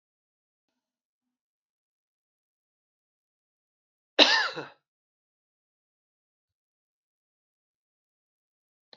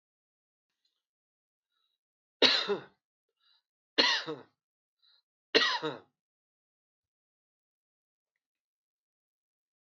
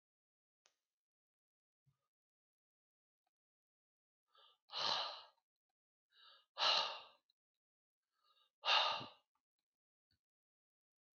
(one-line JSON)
{"cough_length": "9.0 s", "cough_amplitude": 26910, "cough_signal_mean_std_ratio": 0.14, "three_cough_length": "9.8 s", "three_cough_amplitude": 12872, "three_cough_signal_mean_std_ratio": 0.23, "exhalation_length": "11.2 s", "exhalation_amplitude": 3528, "exhalation_signal_mean_std_ratio": 0.25, "survey_phase": "beta (2021-08-13 to 2022-03-07)", "age": "65+", "gender": "Male", "wearing_mask": "No", "symptom_cough_any": true, "symptom_runny_or_blocked_nose": true, "smoker_status": "Ex-smoker", "respiratory_condition_asthma": false, "respiratory_condition_other": false, "recruitment_source": "REACT", "submission_delay": "2 days", "covid_test_result": "Negative", "covid_test_method": "RT-qPCR", "influenza_a_test_result": "Negative", "influenza_b_test_result": "Negative"}